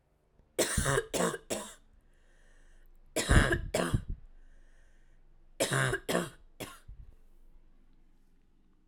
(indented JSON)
{
  "three_cough_length": "8.9 s",
  "three_cough_amplitude": 9251,
  "three_cough_signal_mean_std_ratio": 0.42,
  "survey_phase": "alpha (2021-03-01 to 2021-08-12)",
  "age": "18-44",
  "gender": "Female",
  "wearing_mask": "No",
  "symptom_cough_any": true,
  "symptom_new_continuous_cough": true,
  "symptom_fatigue": true,
  "symptom_fever_high_temperature": true,
  "symptom_change_to_sense_of_smell_or_taste": true,
  "symptom_loss_of_taste": true,
  "symptom_onset": "4 days",
  "smoker_status": "Never smoked",
  "respiratory_condition_asthma": false,
  "respiratory_condition_other": false,
  "recruitment_source": "Test and Trace",
  "submission_delay": "2 days",
  "covid_test_result": "Positive",
  "covid_test_method": "RT-qPCR"
}